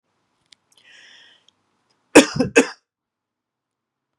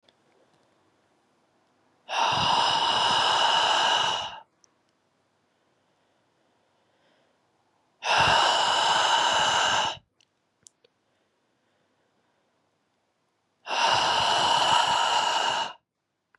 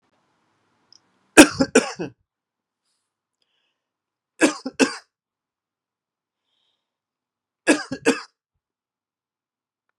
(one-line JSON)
{"cough_length": "4.2 s", "cough_amplitude": 32768, "cough_signal_mean_std_ratio": 0.19, "exhalation_length": "16.4 s", "exhalation_amplitude": 12053, "exhalation_signal_mean_std_ratio": 0.55, "three_cough_length": "10.0 s", "three_cough_amplitude": 32768, "three_cough_signal_mean_std_ratio": 0.19, "survey_phase": "beta (2021-08-13 to 2022-03-07)", "age": "18-44", "gender": "Male", "wearing_mask": "No", "symptom_none": true, "smoker_status": "Never smoked", "respiratory_condition_asthma": false, "respiratory_condition_other": false, "recruitment_source": "REACT", "submission_delay": "1 day", "covid_test_result": "Negative", "covid_test_method": "RT-qPCR"}